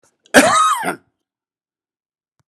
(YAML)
cough_length: 2.5 s
cough_amplitude: 32768
cough_signal_mean_std_ratio: 0.37
survey_phase: beta (2021-08-13 to 2022-03-07)
age: 65+
gender: Male
wearing_mask: 'No'
symptom_none: true
smoker_status: Ex-smoker
respiratory_condition_asthma: false
respiratory_condition_other: false
recruitment_source: REACT
submission_delay: 1 day
covid_test_result: Negative
covid_test_method: RT-qPCR